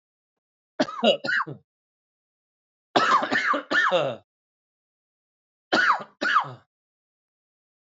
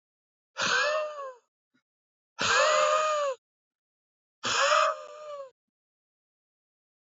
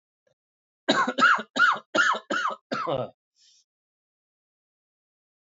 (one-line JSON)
{"three_cough_length": "7.9 s", "three_cough_amplitude": 19703, "three_cough_signal_mean_std_ratio": 0.42, "exhalation_length": "7.2 s", "exhalation_amplitude": 9532, "exhalation_signal_mean_std_ratio": 0.48, "cough_length": "5.5 s", "cough_amplitude": 16332, "cough_signal_mean_std_ratio": 0.4, "survey_phase": "alpha (2021-03-01 to 2021-08-12)", "age": "18-44", "gender": "Male", "wearing_mask": "No", "symptom_new_continuous_cough": true, "symptom_fever_high_temperature": true, "symptom_change_to_sense_of_smell_or_taste": true, "symptom_onset": "6 days", "smoker_status": "Never smoked", "respiratory_condition_asthma": false, "respiratory_condition_other": false, "recruitment_source": "Test and Trace", "submission_delay": "3 days", "covid_test_result": "Positive", "covid_test_method": "RT-qPCR", "covid_ct_value": 12.8, "covid_ct_gene": "ORF1ab gene", "covid_ct_mean": 13.4, "covid_viral_load": "40000000 copies/ml", "covid_viral_load_category": "High viral load (>1M copies/ml)"}